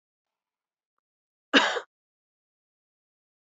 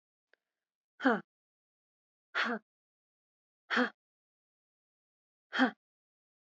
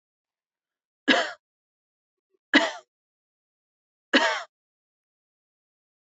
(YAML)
cough_length: 3.5 s
cough_amplitude: 20214
cough_signal_mean_std_ratio: 0.19
exhalation_length: 6.5 s
exhalation_amplitude: 5898
exhalation_signal_mean_std_ratio: 0.25
three_cough_length: 6.1 s
three_cough_amplitude: 19779
three_cough_signal_mean_std_ratio: 0.24
survey_phase: beta (2021-08-13 to 2022-03-07)
age: 18-44
gender: Female
wearing_mask: 'No'
symptom_runny_or_blocked_nose: true
symptom_fatigue: true
smoker_status: Never smoked
respiratory_condition_asthma: false
respiratory_condition_other: false
recruitment_source: Test and Trace
submission_delay: 1 day
covid_test_result: Positive
covid_test_method: RT-qPCR
covid_ct_value: 26.3
covid_ct_gene: ORF1ab gene
covid_ct_mean: 27.1
covid_viral_load: 1300 copies/ml
covid_viral_load_category: Minimal viral load (< 10K copies/ml)